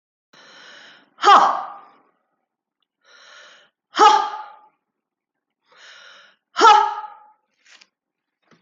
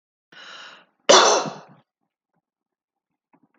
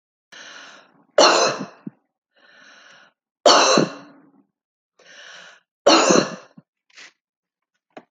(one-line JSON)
{"exhalation_length": "8.6 s", "exhalation_amplitude": 28622, "exhalation_signal_mean_std_ratio": 0.29, "cough_length": "3.6 s", "cough_amplitude": 28969, "cough_signal_mean_std_ratio": 0.26, "three_cough_length": "8.1 s", "three_cough_amplitude": 29253, "three_cough_signal_mean_std_ratio": 0.33, "survey_phase": "alpha (2021-03-01 to 2021-08-12)", "age": "65+", "gender": "Female", "wearing_mask": "No", "symptom_none": true, "symptom_onset": "12 days", "smoker_status": "Never smoked", "respiratory_condition_asthma": false, "respiratory_condition_other": false, "recruitment_source": "REACT", "submission_delay": "1 day", "covid_test_result": "Negative", "covid_test_method": "RT-qPCR"}